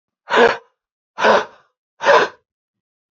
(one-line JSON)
{"exhalation_length": "3.2 s", "exhalation_amplitude": 29145, "exhalation_signal_mean_std_ratio": 0.39, "survey_phase": "beta (2021-08-13 to 2022-03-07)", "age": "18-44", "gender": "Male", "wearing_mask": "No", "symptom_cough_any": true, "symptom_runny_or_blocked_nose": true, "symptom_diarrhoea": true, "symptom_other": true, "symptom_onset": "3 days", "smoker_status": "Never smoked", "respiratory_condition_asthma": false, "respiratory_condition_other": false, "recruitment_source": "Test and Trace", "submission_delay": "2 days", "covid_test_result": "Positive", "covid_test_method": "ePCR"}